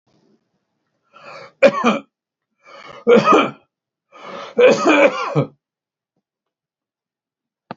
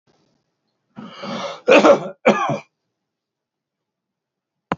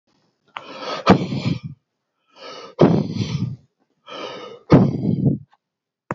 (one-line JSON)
{"three_cough_length": "7.8 s", "three_cough_amplitude": 32768, "three_cough_signal_mean_std_ratio": 0.36, "cough_length": "4.8 s", "cough_amplitude": 31888, "cough_signal_mean_std_ratio": 0.31, "exhalation_length": "6.1 s", "exhalation_amplitude": 29271, "exhalation_signal_mean_std_ratio": 0.43, "survey_phase": "beta (2021-08-13 to 2022-03-07)", "age": "65+", "gender": "Male", "wearing_mask": "No", "symptom_none": true, "smoker_status": "Ex-smoker", "respiratory_condition_asthma": false, "respiratory_condition_other": false, "recruitment_source": "REACT", "submission_delay": "1 day", "covid_test_result": "Negative", "covid_test_method": "RT-qPCR"}